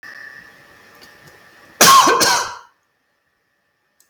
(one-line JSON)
{"cough_length": "4.1 s", "cough_amplitude": 32768, "cough_signal_mean_std_ratio": 0.35, "survey_phase": "beta (2021-08-13 to 2022-03-07)", "age": "65+", "gender": "Male", "wearing_mask": "No", "symptom_cough_any": true, "smoker_status": "Never smoked", "respiratory_condition_asthma": false, "respiratory_condition_other": false, "recruitment_source": "REACT", "submission_delay": "2 days", "covid_test_result": "Negative", "covid_test_method": "RT-qPCR", "influenza_a_test_result": "Negative", "influenza_b_test_result": "Negative"}